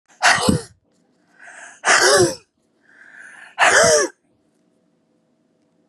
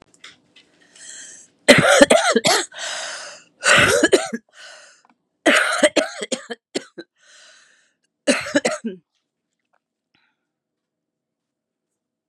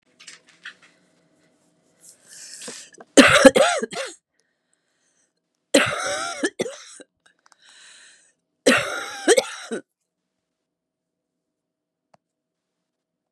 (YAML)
exhalation_length: 5.9 s
exhalation_amplitude: 29440
exhalation_signal_mean_std_ratio: 0.41
cough_length: 12.3 s
cough_amplitude: 32768
cough_signal_mean_std_ratio: 0.36
three_cough_length: 13.3 s
three_cough_amplitude: 32768
three_cough_signal_mean_std_ratio: 0.27
survey_phase: beta (2021-08-13 to 2022-03-07)
age: 65+
gender: Female
wearing_mask: 'No'
symptom_cough_any: true
symptom_runny_or_blocked_nose: true
symptom_shortness_of_breath: true
symptom_sore_throat: true
symptom_fatigue: true
symptom_fever_high_temperature: true
symptom_headache: true
symptom_other: true
symptom_onset: 7 days
smoker_status: Ex-smoker
respiratory_condition_asthma: false
respiratory_condition_other: false
recruitment_source: Test and Trace
submission_delay: 2 days
covid_test_result: Positive
covid_test_method: RT-qPCR
covid_ct_value: 19.5
covid_ct_gene: ORF1ab gene
covid_ct_mean: 19.7
covid_viral_load: 340000 copies/ml
covid_viral_load_category: Low viral load (10K-1M copies/ml)